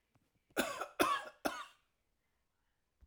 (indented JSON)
{
  "cough_length": "3.1 s",
  "cough_amplitude": 4722,
  "cough_signal_mean_std_ratio": 0.35,
  "survey_phase": "alpha (2021-03-01 to 2021-08-12)",
  "age": "45-64",
  "gender": "Male",
  "wearing_mask": "No",
  "symptom_none": true,
  "smoker_status": "Ex-smoker",
  "respiratory_condition_asthma": false,
  "respiratory_condition_other": false,
  "recruitment_source": "REACT",
  "submission_delay": "1 day",
  "covid_test_result": "Negative",
  "covid_test_method": "RT-qPCR"
}